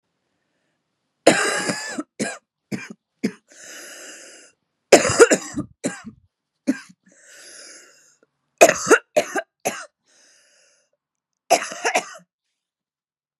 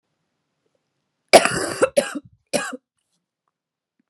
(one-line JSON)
{"cough_length": "13.4 s", "cough_amplitude": 32768, "cough_signal_mean_std_ratio": 0.29, "three_cough_length": "4.1 s", "three_cough_amplitude": 32768, "three_cough_signal_mean_std_ratio": 0.26, "survey_phase": "beta (2021-08-13 to 2022-03-07)", "age": "18-44", "gender": "Female", "wearing_mask": "No", "symptom_cough_any": true, "symptom_new_continuous_cough": true, "symptom_runny_or_blocked_nose": true, "symptom_shortness_of_breath": true, "symptom_sore_throat": true, "symptom_abdominal_pain": true, "symptom_diarrhoea": true, "symptom_fatigue": true, "symptom_fever_high_temperature": true, "symptom_headache": true, "symptom_onset": "7 days", "smoker_status": "Never smoked", "respiratory_condition_asthma": false, "respiratory_condition_other": true, "recruitment_source": "Test and Trace", "submission_delay": "1 day", "covid_test_result": "Negative", "covid_test_method": "RT-qPCR"}